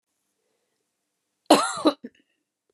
cough_length: 2.7 s
cough_amplitude: 24608
cough_signal_mean_std_ratio: 0.24
survey_phase: beta (2021-08-13 to 2022-03-07)
age: 18-44
gender: Female
wearing_mask: 'No'
symptom_cough_any: true
symptom_runny_or_blocked_nose: true
symptom_sore_throat: true
symptom_diarrhoea: true
symptom_fatigue: true
symptom_change_to_sense_of_smell_or_taste: true
symptom_loss_of_taste: true
smoker_status: Ex-smoker
respiratory_condition_asthma: false
respiratory_condition_other: false
recruitment_source: Test and Trace
submission_delay: 2 days
covid_test_result: Positive
covid_test_method: ePCR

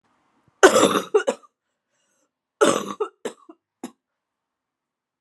cough_length: 5.2 s
cough_amplitude: 32767
cough_signal_mean_std_ratio: 0.29
survey_phase: alpha (2021-03-01 to 2021-08-12)
age: 45-64
gender: Female
wearing_mask: 'No'
symptom_cough_any: true
symptom_fever_high_temperature: true
symptom_headache: true
smoker_status: Never smoked
respiratory_condition_asthma: true
respiratory_condition_other: false
recruitment_source: Test and Trace
submission_delay: 2 days
covid_test_result: Positive
covid_test_method: RT-qPCR
covid_ct_value: 15.2
covid_ct_gene: ORF1ab gene
covid_ct_mean: 15.6
covid_viral_load: 7400000 copies/ml
covid_viral_load_category: High viral load (>1M copies/ml)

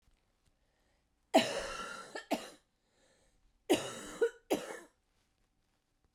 cough_length: 6.1 s
cough_amplitude: 7005
cough_signal_mean_std_ratio: 0.32
survey_phase: beta (2021-08-13 to 2022-03-07)
age: 45-64
gender: Female
wearing_mask: 'No'
symptom_cough_any: true
symptom_new_continuous_cough: true
symptom_runny_or_blocked_nose: true
symptom_sore_throat: true
symptom_diarrhoea: true
symptom_fatigue: true
symptom_headache: true
symptom_change_to_sense_of_smell_or_taste: true
symptom_loss_of_taste: true
symptom_onset: 7 days
smoker_status: Current smoker (e-cigarettes or vapes only)
respiratory_condition_asthma: false
respiratory_condition_other: false
recruitment_source: Test and Trace
submission_delay: 2 days
covid_test_result: Positive
covid_test_method: RT-qPCR
covid_ct_value: 20.4
covid_ct_gene: ORF1ab gene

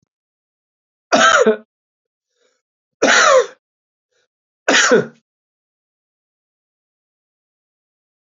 three_cough_length: 8.4 s
three_cough_amplitude: 31981
three_cough_signal_mean_std_ratio: 0.31
survey_phase: beta (2021-08-13 to 2022-03-07)
age: 45-64
gender: Male
wearing_mask: 'No'
symptom_cough_any: true
symptom_new_continuous_cough: true
symptom_runny_or_blocked_nose: true
symptom_shortness_of_breath: true
symptom_sore_throat: true
symptom_fatigue: true
symptom_fever_high_temperature: true
symptom_headache: true
symptom_onset: 3 days
smoker_status: Ex-smoker
respiratory_condition_asthma: false
respiratory_condition_other: false
recruitment_source: Test and Trace
submission_delay: 2 days
covid_test_result: Positive
covid_test_method: RT-qPCR
covid_ct_value: 31.9
covid_ct_gene: N gene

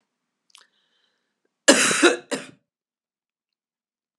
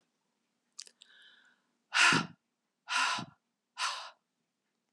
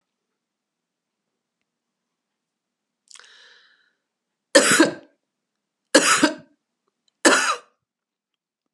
cough_length: 4.2 s
cough_amplitude: 32649
cough_signal_mean_std_ratio: 0.26
exhalation_length: 4.9 s
exhalation_amplitude: 8397
exhalation_signal_mean_std_ratio: 0.32
three_cough_length: 8.7 s
three_cough_amplitude: 32394
three_cough_signal_mean_std_ratio: 0.26
survey_phase: beta (2021-08-13 to 2022-03-07)
age: 65+
gender: Female
wearing_mask: 'No'
symptom_runny_or_blocked_nose: true
smoker_status: Never smoked
respiratory_condition_asthma: false
respiratory_condition_other: false
recruitment_source: Test and Trace
submission_delay: 1 day
covid_test_result: Negative
covid_test_method: ePCR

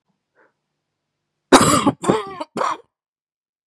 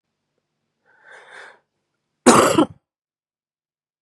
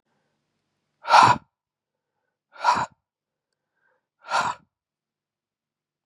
three_cough_length: 3.7 s
three_cough_amplitude: 32768
three_cough_signal_mean_std_ratio: 0.33
cough_length: 4.0 s
cough_amplitude: 32767
cough_signal_mean_std_ratio: 0.25
exhalation_length: 6.1 s
exhalation_amplitude: 31632
exhalation_signal_mean_std_ratio: 0.24
survey_phase: beta (2021-08-13 to 2022-03-07)
age: 18-44
gender: Male
wearing_mask: 'No'
symptom_cough_any: true
symptom_runny_or_blocked_nose: true
smoker_status: Ex-smoker
respiratory_condition_asthma: true
respiratory_condition_other: false
recruitment_source: Test and Trace
submission_delay: 1 day
covid_test_result: Positive
covid_test_method: LFT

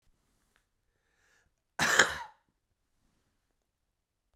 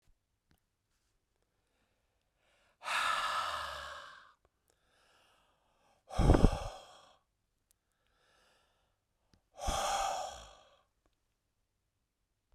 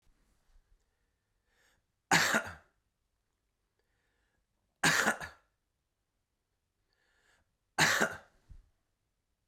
cough_length: 4.4 s
cough_amplitude: 22984
cough_signal_mean_std_ratio: 0.21
exhalation_length: 12.5 s
exhalation_amplitude: 14694
exhalation_signal_mean_std_ratio: 0.29
three_cough_length: 9.5 s
three_cough_amplitude: 9044
three_cough_signal_mean_std_ratio: 0.26
survey_phase: beta (2021-08-13 to 2022-03-07)
age: 45-64
gender: Male
wearing_mask: 'No'
symptom_cough_any: true
symptom_fatigue: true
symptom_change_to_sense_of_smell_or_taste: true
symptom_loss_of_taste: true
symptom_onset: 4 days
smoker_status: Ex-smoker
respiratory_condition_asthma: false
respiratory_condition_other: false
recruitment_source: Test and Trace
submission_delay: 2 days
covid_test_result: Positive
covid_test_method: RT-qPCR
covid_ct_value: 13.8
covid_ct_gene: ORF1ab gene
covid_ct_mean: 15.1
covid_viral_load: 11000000 copies/ml
covid_viral_load_category: High viral load (>1M copies/ml)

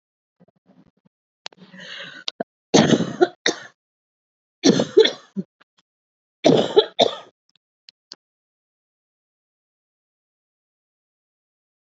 three_cough_length: 11.9 s
three_cough_amplitude: 28792
three_cough_signal_mean_std_ratio: 0.25
survey_phase: alpha (2021-03-01 to 2021-08-12)
age: 45-64
gender: Female
wearing_mask: 'No'
symptom_cough_any: true
symptom_new_continuous_cough: true
symptom_shortness_of_breath: true
symptom_fatigue: true
symptom_fever_high_temperature: true
symptom_headache: true
symptom_change_to_sense_of_smell_or_taste: true
symptom_loss_of_taste: true
smoker_status: Never smoked
respiratory_condition_asthma: false
respiratory_condition_other: false
recruitment_source: Test and Trace
submission_delay: 2 days
covid_test_result: Positive
covid_test_method: LFT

